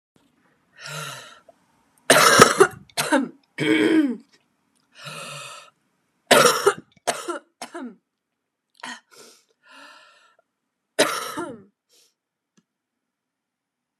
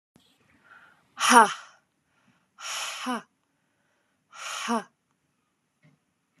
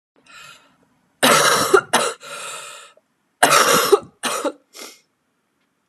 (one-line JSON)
{"three_cough_length": "14.0 s", "three_cough_amplitude": 32768, "three_cough_signal_mean_std_ratio": 0.32, "exhalation_length": "6.4 s", "exhalation_amplitude": 28467, "exhalation_signal_mean_std_ratio": 0.25, "cough_length": "5.9 s", "cough_amplitude": 32768, "cough_signal_mean_std_ratio": 0.43, "survey_phase": "alpha (2021-03-01 to 2021-08-12)", "age": "18-44", "gender": "Female", "wearing_mask": "No", "symptom_cough_any": true, "symptom_fatigue": true, "symptom_fever_high_temperature": true, "symptom_headache": true, "symptom_change_to_sense_of_smell_or_taste": true, "symptom_onset": "3 days", "smoker_status": "Never smoked", "respiratory_condition_asthma": false, "respiratory_condition_other": false, "recruitment_source": "Test and Trace", "submission_delay": "2 days", "covid_test_result": "Positive", "covid_test_method": "RT-qPCR", "covid_ct_value": 15.6, "covid_ct_gene": "ORF1ab gene", "covid_ct_mean": 16.1, "covid_viral_load": "5300000 copies/ml", "covid_viral_load_category": "High viral load (>1M copies/ml)"}